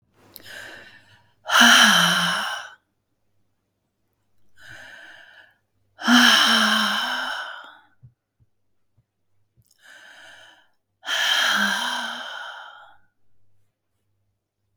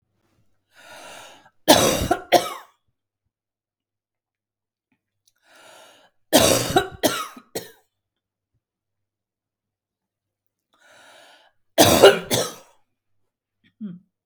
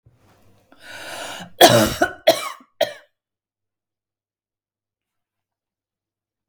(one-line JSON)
{"exhalation_length": "14.8 s", "exhalation_amplitude": 32220, "exhalation_signal_mean_std_ratio": 0.4, "three_cough_length": "14.3 s", "three_cough_amplitude": 32768, "three_cough_signal_mean_std_ratio": 0.27, "cough_length": "6.5 s", "cough_amplitude": 32768, "cough_signal_mean_std_ratio": 0.25, "survey_phase": "beta (2021-08-13 to 2022-03-07)", "age": "45-64", "gender": "Female", "wearing_mask": "No", "symptom_none": true, "smoker_status": "Never smoked", "respiratory_condition_asthma": false, "respiratory_condition_other": false, "recruitment_source": "REACT", "submission_delay": "1 day", "covid_test_result": "Negative", "covid_test_method": "RT-qPCR"}